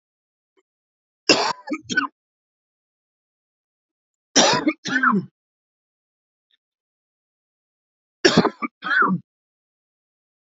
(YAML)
three_cough_length: 10.5 s
three_cough_amplitude: 30874
three_cough_signal_mean_std_ratio: 0.31
survey_phase: beta (2021-08-13 to 2022-03-07)
age: 45-64
gender: Male
wearing_mask: 'No'
symptom_cough_any: true
smoker_status: Ex-smoker
respiratory_condition_asthma: false
respiratory_condition_other: false
recruitment_source: REACT
submission_delay: 2 days
covid_test_result: Negative
covid_test_method: RT-qPCR
influenza_a_test_result: Negative
influenza_b_test_result: Negative